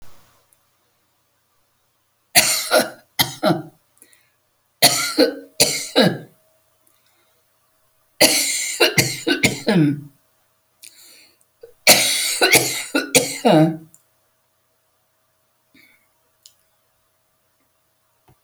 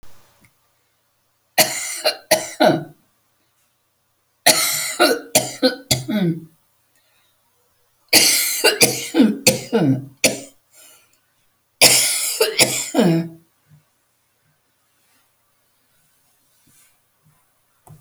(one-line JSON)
{"cough_length": "18.4 s", "cough_amplitude": 32768, "cough_signal_mean_std_ratio": 0.38, "three_cough_length": "18.0 s", "three_cough_amplitude": 32768, "three_cough_signal_mean_std_ratio": 0.41, "survey_phase": "beta (2021-08-13 to 2022-03-07)", "age": "65+", "gender": "Female", "wearing_mask": "No", "symptom_shortness_of_breath": true, "smoker_status": "Ex-smoker", "respiratory_condition_asthma": true, "respiratory_condition_other": true, "recruitment_source": "REACT", "submission_delay": "2 days", "covid_test_result": "Negative", "covid_test_method": "RT-qPCR"}